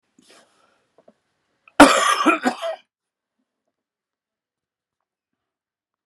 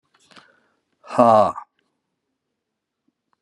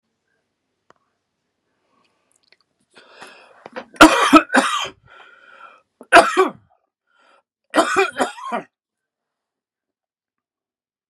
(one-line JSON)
{"cough_length": "6.1 s", "cough_amplitude": 32768, "cough_signal_mean_std_ratio": 0.24, "exhalation_length": "3.4 s", "exhalation_amplitude": 27703, "exhalation_signal_mean_std_ratio": 0.25, "three_cough_length": "11.1 s", "three_cough_amplitude": 32768, "three_cough_signal_mean_std_ratio": 0.26, "survey_phase": "beta (2021-08-13 to 2022-03-07)", "age": "65+", "gender": "Male", "wearing_mask": "No", "symptom_cough_any": true, "symptom_new_continuous_cough": true, "symptom_runny_or_blocked_nose": true, "symptom_sore_throat": true, "symptom_fatigue": true, "symptom_headache": true, "symptom_onset": "2 days", "smoker_status": "Ex-smoker", "respiratory_condition_asthma": false, "respiratory_condition_other": false, "recruitment_source": "Test and Trace", "submission_delay": "2 days", "covid_test_result": "Positive", "covid_test_method": "RT-qPCR", "covid_ct_value": 15.9, "covid_ct_gene": "N gene"}